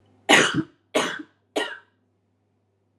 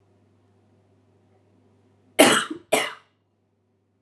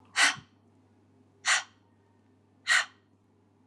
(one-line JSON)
{"three_cough_length": "3.0 s", "three_cough_amplitude": 27038, "three_cough_signal_mean_std_ratio": 0.34, "cough_length": "4.0 s", "cough_amplitude": 32591, "cough_signal_mean_std_ratio": 0.25, "exhalation_length": "3.7 s", "exhalation_amplitude": 10229, "exhalation_signal_mean_std_ratio": 0.31, "survey_phase": "alpha (2021-03-01 to 2021-08-12)", "age": "18-44", "gender": "Female", "wearing_mask": "Yes", "symptom_none": true, "smoker_status": "Current smoker (e-cigarettes or vapes only)", "respiratory_condition_asthma": false, "respiratory_condition_other": false, "recruitment_source": "Test and Trace", "submission_delay": "0 days", "covid_test_result": "Negative", "covid_test_method": "LFT"}